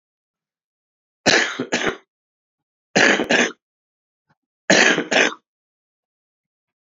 {"three_cough_length": "6.8 s", "three_cough_amplitude": 32768, "three_cough_signal_mean_std_ratio": 0.36, "survey_phase": "alpha (2021-03-01 to 2021-08-12)", "age": "65+", "gender": "Male", "wearing_mask": "No", "symptom_abdominal_pain": true, "symptom_diarrhoea": true, "symptom_headache": true, "symptom_onset": "3 days", "smoker_status": "Never smoked", "respiratory_condition_asthma": false, "respiratory_condition_other": false, "recruitment_source": "Test and Trace", "submission_delay": "1 day", "covid_test_result": "Positive", "covid_test_method": "RT-qPCR", "covid_ct_value": 22.2, "covid_ct_gene": "ORF1ab gene", "covid_ct_mean": 22.6, "covid_viral_load": "39000 copies/ml", "covid_viral_load_category": "Low viral load (10K-1M copies/ml)"}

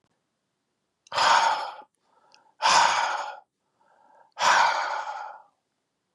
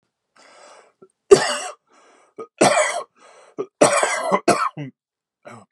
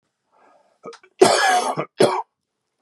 {"exhalation_length": "6.1 s", "exhalation_amplitude": 17026, "exhalation_signal_mean_std_ratio": 0.46, "three_cough_length": "5.7 s", "three_cough_amplitude": 32768, "three_cough_signal_mean_std_ratio": 0.38, "cough_length": "2.8 s", "cough_amplitude": 32224, "cough_signal_mean_std_ratio": 0.41, "survey_phase": "beta (2021-08-13 to 2022-03-07)", "age": "45-64", "gender": "Male", "wearing_mask": "No", "symptom_cough_any": true, "symptom_shortness_of_breath": true, "symptom_fatigue": true, "symptom_headache": true, "symptom_other": true, "symptom_onset": "13 days", "smoker_status": "Never smoked", "respiratory_condition_asthma": true, "respiratory_condition_other": false, "recruitment_source": "REACT", "submission_delay": "0 days", "covid_test_result": "Negative", "covid_test_method": "RT-qPCR"}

